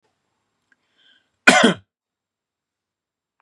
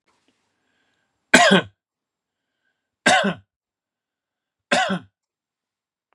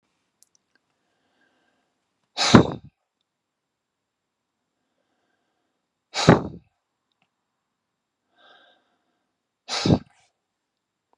{"cough_length": "3.4 s", "cough_amplitude": 32768, "cough_signal_mean_std_ratio": 0.21, "three_cough_length": "6.1 s", "three_cough_amplitude": 32767, "three_cough_signal_mean_std_ratio": 0.27, "exhalation_length": "11.2 s", "exhalation_amplitude": 32768, "exhalation_signal_mean_std_ratio": 0.18, "survey_phase": "beta (2021-08-13 to 2022-03-07)", "age": "45-64", "gender": "Male", "wearing_mask": "No", "symptom_none": true, "smoker_status": "Never smoked", "respiratory_condition_asthma": false, "respiratory_condition_other": false, "recruitment_source": "REACT", "submission_delay": "2 days", "covid_test_result": "Negative", "covid_test_method": "RT-qPCR", "influenza_a_test_result": "Negative", "influenza_b_test_result": "Negative"}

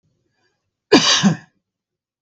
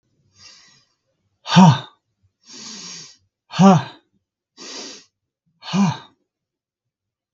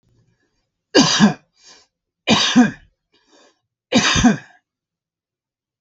{"cough_length": "2.2 s", "cough_amplitude": 32768, "cough_signal_mean_std_ratio": 0.34, "exhalation_length": "7.3 s", "exhalation_amplitude": 32766, "exhalation_signal_mean_std_ratio": 0.27, "three_cough_length": "5.8 s", "three_cough_amplitude": 32768, "three_cough_signal_mean_std_ratio": 0.37, "survey_phase": "beta (2021-08-13 to 2022-03-07)", "age": "45-64", "gender": "Male", "wearing_mask": "No", "symptom_runny_or_blocked_nose": true, "symptom_onset": "4 days", "smoker_status": "Never smoked", "respiratory_condition_asthma": false, "respiratory_condition_other": false, "recruitment_source": "REACT", "submission_delay": "1 day", "covid_test_result": "Negative", "covid_test_method": "RT-qPCR", "influenza_a_test_result": "Negative", "influenza_b_test_result": "Negative"}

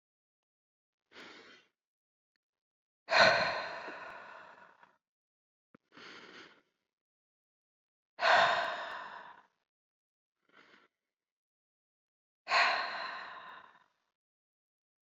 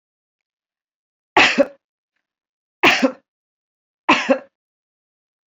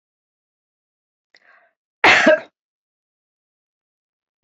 {"exhalation_length": "15.1 s", "exhalation_amplitude": 11894, "exhalation_signal_mean_std_ratio": 0.29, "three_cough_length": "5.5 s", "three_cough_amplitude": 27990, "three_cough_signal_mean_std_ratio": 0.28, "cough_length": "4.4 s", "cough_amplitude": 29263, "cough_signal_mean_std_ratio": 0.23, "survey_phase": "beta (2021-08-13 to 2022-03-07)", "age": "45-64", "gender": "Female", "wearing_mask": "No", "symptom_none": true, "smoker_status": "Never smoked", "respiratory_condition_asthma": false, "respiratory_condition_other": false, "recruitment_source": "REACT", "submission_delay": "1 day", "covid_test_result": "Negative", "covid_test_method": "RT-qPCR"}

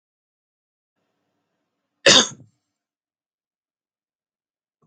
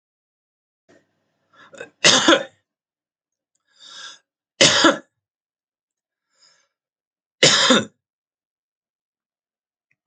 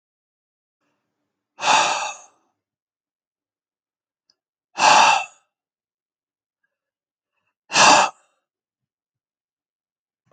{"cough_length": "4.9 s", "cough_amplitude": 32267, "cough_signal_mean_std_ratio": 0.16, "three_cough_length": "10.1 s", "three_cough_amplitude": 32767, "three_cough_signal_mean_std_ratio": 0.26, "exhalation_length": "10.3 s", "exhalation_amplitude": 30550, "exhalation_signal_mean_std_ratio": 0.27, "survey_phase": "alpha (2021-03-01 to 2021-08-12)", "age": "45-64", "gender": "Male", "wearing_mask": "No", "symptom_none": true, "smoker_status": "Ex-smoker", "respiratory_condition_asthma": false, "respiratory_condition_other": false, "recruitment_source": "REACT", "submission_delay": "2 days", "covid_test_result": "Negative", "covid_test_method": "RT-qPCR"}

